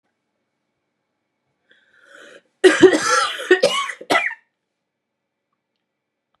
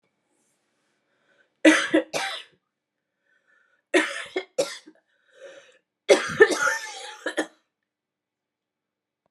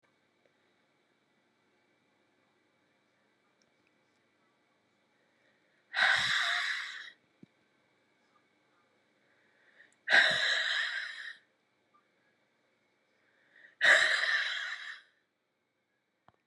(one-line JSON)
{"cough_length": "6.4 s", "cough_amplitude": 32750, "cough_signal_mean_std_ratio": 0.31, "three_cough_length": "9.3 s", "three_cough_amplitude": 28521, "three_cough_signal_mean_std_ratio": 0.29, "exhalation_length": "16.5 s", "exhalation_amplitude": 11800, "exhalation_signal_mean_std_ratio": 0.32, "survey_phase": "beta (2021-08-13 to 2022-03-07)", "age": "45-64", "gender": "Female", "wearing_mask": "No", "symptom_cough_any": true, "symptom_runny_or_blocked_nose": true, "symptom_sore_throat": true, "symptom_headache": true, "symptom_other": true, "symptom_onset": "2 days", "smoker_status": "Never smoked", "respiratory_condition_asthma": false, "respiratory_condition_other": false, "recruitment_source": "Test and Trace", "submission_delay": "2 days", "covid_test_result": "Positive", "covid_test_method": "RT-qPCR", "covid_ct_value": 23.0, "covid_ct_gene": "ORF1ab gene"}